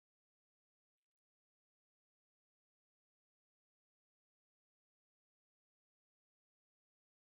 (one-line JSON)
{"three_cough_length": "7.3 s", "three_cough_amplitude": 1, "three_cough_signal_mean_std_ratio": 0.02, "survey_phase": "beta (2021-08-13 to 2022-03-07)", "age": "45-64", "gender": "Male", "wearing_mask": "No", "symptom_cough_any": true, "symptom_runny_or_blocked_nose": true, "smoker_status": "Current smoker (11 or more cigarettes per day)", "respiratory_condition_asthma": false, "respiratory_condition_other": false, "recruitment_source": "REACT", "submission_delay": "3 days", "covid_test_result": "Negative", "covid_test_method": "RT-qPCR"}